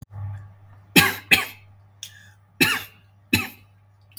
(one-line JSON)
{"cough_length": "4.2 s", "cough_amplitude": 32768, "cough_signal_mean_std_ratio": 0.34, "survey_phase": "beta (2021-08-13 to 2022-03-07)", "age": "18-44", "gender": "Male", "wearing_mask": "Yes", "symptom_none": true, "smoker_status": "Never smoked", "respiratory_condition_asthma": false, "respiratory_condition_other": false, "recruitment_source": "REACT", "submission_delay": "2 days", "covid_test_result": "Negative", "covid_test_method": "RT-qPCR", "influenza_a_test_result": "Negative", "influenza_b_test_result": "Negative"}